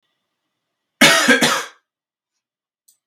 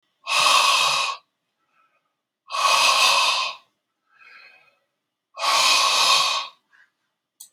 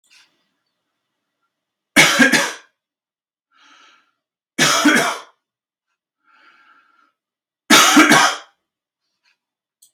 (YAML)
cough_length: 3.1 s
cough_amplitude: 32768
cough_signal_mean_std_ratio: 0.34
exhalation_length: 7.5 s
exhalation_amplitude: 19837
exhalation_signal_mean_std_ratio: 0.55
three_cough_length: 9.9 s
three_cough_amplitude: 32768
three_cough_signal_mean_std_ratio: 0.33
survey_phase: beta (2021-08-13 to 2022-03-07)
age: 45-64
gender: Male
wearing_mask: 'No'
symptom_none: true
symptom_onset: 12 days
smoker_status: Never smoked
respiratory_condition_asthma: false
respiratory_condition_other: false
recruitment_source: REACT
submission_delay: 1 day
covid_test_result: Negative
covid_test_method: RT-qPCR